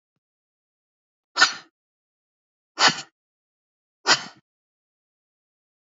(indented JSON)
{
  "exhalation_length": "5.8 s",
  "exhalation_amplitude": 25397,
  "exhalation_signal_mean_std_ratio": 0.2,
  "survey_phase": "beta (2021-08-13 to 2022-03-07)",
  "age": "18-44",
  "gender": "Female",
  "wearing_mask": "No",
  "symptom_none": true,
  "smoker_status": "Never smoked",
  "respiratory_condition_asthma": false,
  "respiratory_condition_other": false,
  "recruitment_source": "REACT",
  "submission_delay": "1 day",
  "covid_test_result": "Negative",
  "covid_test_method": "RT-qPCR"
}